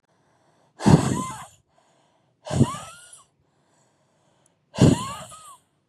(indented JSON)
{
  "exhalation_length": "5.9 s",
  "exhalation_amplitude": 26920,
  "exhalation_signal_mean_std_ratio": 0.29,
  "survey_phase": "beta (2021-08-13 to 2022-03-07)",
  "age": "18-44",
  "gender": "Female",
  "wearing_mask": "No",
  "symptom_cough_any": true,
  "symptom_sore_throat": true,
  "symptom_onset": "13 days",
  "smoker_status": "Never smoked",
  "respiratory_condition_asthma": false,
  "respiratory_condition_other": false,
  "recruitment_source": "REACT",
  "submission_delay": "4 days",
  "covid_test_result": "Negative",
  "covid_test_method": "RT-qPCR"
}